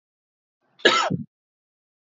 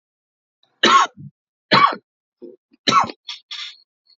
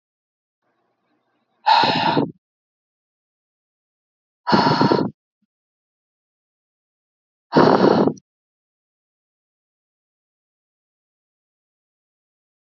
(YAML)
cough_length: 2.1 s
cough_amplitude: 29517
cough_signal_mean_std_ratio: 0.29
three_cough_length: 4.2 s
three_cough_amplitude: 29468
three_cough_signal_mean_std_ratio: 0.34
exhalation_length: 12.8 s
exhalation_amplitude: 32767
exhalation_signal_mean_std_ratio: 0.29
survey_phase: alpha (2021-03-01 to 2021-08-12)
age: 18-44
gender: Male
wearing_mask: 'No'
symptom_cough_any: true
symptom_abdominal_pain: true
symptom_fatigue: true
symptom_fever_high_temperature: true
symptom_change_to_sense_of_smell_or_taste: true
symptom_onset: 2 days
smoker_status: Ex-smoker
respiratory_condition_asthma: false
respiratory_condition_other: false
recruitment_source: Test and Trace
submission_delay: 1 day
covid_test_result: Positive
covid_test_method: RT-qPCR
covid_ct_value: 24.5
covid_ct_gene: N gene